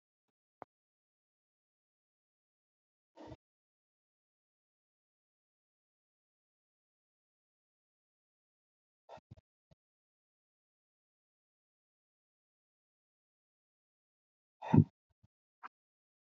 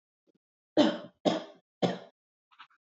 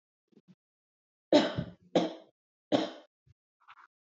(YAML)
exhalation_length: 16.2 s
exhalation_amplitude: 8179
exhalation_signal_mean_std_ratio: 0.07
cough_length: 2.8 s
cough_amplitude: 11954
cough_signal_mean_std_ratio: 0.31
three_cough_length: 4.0 s
three_cough_amplitude: 11121
three_cough_signal_mean_std_ratio: 0.28
survey_phase: beta (2021-08-13 to 2022-03-07)
age: 45-64
gender: Female
wearing_mask: 'No'
symptom_none: true
smoker_status: Current smoker (1 to 10 cigarettes per day)
respiratory_condition_asthma: false
respiratory_condition_other: false
recruitment_source: REACT
submission_delay: 1 day
covid_test_result: Negative
covid_test_method: RT-qPCR
influenza_a_test_result: Negative
influenza_b_test_result: Negative